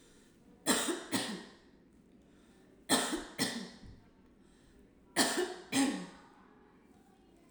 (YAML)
three_cough_length: 7.5 s
three_cough_amplitude: 6253
three_cough_signal_mean_std_ratio: 0.44
survey_phase: alpha (2021-03-01 to 2021-08-12)
age: 18-44
gender: Female
wearing_mask: 'Yes'
symptom_none: true
smoker_status: Never smoked
respiratory_condition_asthma: false
respiratory_condition_other: false
recruitment_source: REACT
submission_delay: 2 days
covid_test_result: Negative
covid_test_method: RT-qPCR